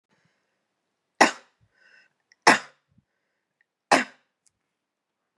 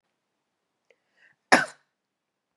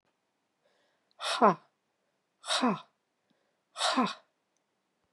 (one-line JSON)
{"three_cough_length": "5.4 s", "three_cough_amplitude": 25048, "three_cough_signal_mean_std_ratio": 0.18, "cough_length": "2.6 s", "cough_amplitude": 28956, "cough_signal_mean_std_ratio": 0.15, "exhalation_length": "5.1 s", "exhalation_amplitude": 11424, "exhalation_signal_mean_std_ratio": 0.31, "survey_phase": "beta (2021-08-13 to 2022-03-07)", "age": "18-44", "gender": "Female", "wearing_mask": "No", "symptom_runny_or_blocked_nose": true, "symptom_sore_throat": true, "symptom_fatigue": true, "symptom_change_to_sense_of_smell_or_taste": true, "symptom_onset": "3 days", "smoker_status": "Ex-smoker", "respiratory_condition_asthma": false, "respiratory_condition_other": false, "recruitment_source": "Test and Trace", "submission_delay": "2 days", "covid_test_result": "Positive", "covid_test_method": "RT-qPCR", "covid_ct_value": 22.7, "covid_ct_gene": "ORF1ab gene"}